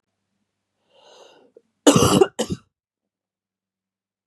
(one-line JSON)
{"cough_length": "4.3 s", "cough_amplitude": 32640, "cough_signal_mean_std_ratio": 0.25, "survey_phase": "beta (2021-08-13 to 2022-03-07)", "age": "18-44", "gender": "Female", "wearing_mask": "No", "symptom_cough_any": true, "symptom_runny_or_blocked_nose": true, "symptom_sore_throat": true, "symptom_fatigue": true, "symptom_headache": true, "symptom_change_to_sense_of_smell_or_taste": true, "symptom_loss_of_taste": true, "symptom_onset": "3 days", "smoker_status": "Ex-smoker", "respiratory_condition_asthma": false, "respiratory_condition_other": false, "recruitment_source": "Test and Trace", "submission_delay": "2 days", "covid_test_result": "Positive", "covid_test_method": "RT-qPCR"}